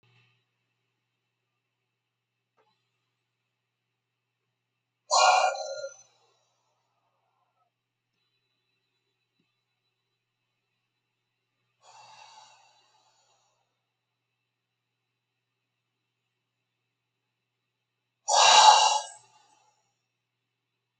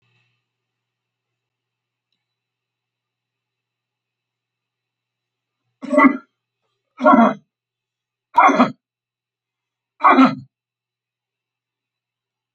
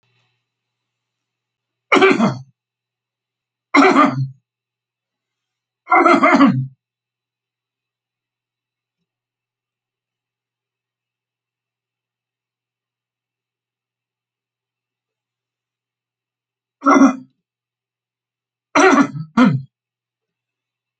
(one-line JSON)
{"exhalation_length": "21.0 s", "exhalation_amplitude": 21200, "exhalation_signal_mean_std_ratio": 0.19, "cough_length": "12.5 s", "cough_amplitude": 29744, "cough_signal_mean_std_ratio": 0.24, "three_cough_length": "21.0 s", "three_cough_amplitude": 32767, "three_cough_signal_mean_std_ratio": 0.28, "survey_phase": "alpha (2021-03-01 to 2021-08-12)", "age": "65+", "gender": "Male", "wearing_mask": "No", "symptom_none": true, "smoker_status": "Ex-smoker", "respiratory_condition_asthma": false, "respiratory_condition_other": false, "recruitment_source": "REACT", "submission_delay": "2 days", "covid_test_result": "Negative", "covid_test_method": "RT-qPCR"}